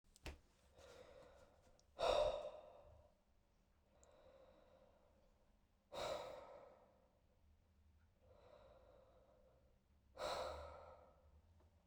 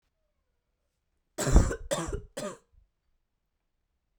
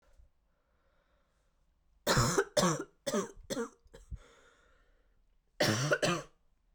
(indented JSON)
{
  "exhalation_length": "11.9 s",
  "exhalation_amplitude": 1513,
  "exhalation_signal_mean_std_ratio": 0.36,
  "cough_length": "4.2 s",
  "cough_amplitude": 18907,
  "cough_signal_mean_std_ratio": 0.28,
  "three_cough_length": "6.7 s",
  "three_cough_amplitude": 6001,
  "three_cough_signal_mean_std_ratio": 0.4,
  "survey_phase": "beta (2021-08-13 to 2022-03-07)",
  "age": "18-44",
  "gender": "Female",
  "wearing_mask": "No",
  "symptom_cough_any": true,
  "symptom_runny_or_blocked_nose": true,
  "symptom_fatigue": true,
  "symptom_fever_high_temperature": true,
  "symptom_headache": true,
  "symptom_onset": "3 days",
  "smoker_status": "Never smoked",
  "respiratory_condition_asthma": false,
  "respiratory_condition_other": false,
  "recruitment_source": "Test and Trace",
  "submission_delay": "1 day",
  "covid_test_result": "Positive",
  "covid_test_method": "RT-qPCR",
  "covid_ct_value": 22.1,
  "covid_ct_gene": "ORF1ab gene",
  "covid_ct_mean": 23.1,
  "covid_viral_load": "27000 copies/ml",
  "covid_viral_load_category": "Low viral load (10K-1M copies/ml)"
}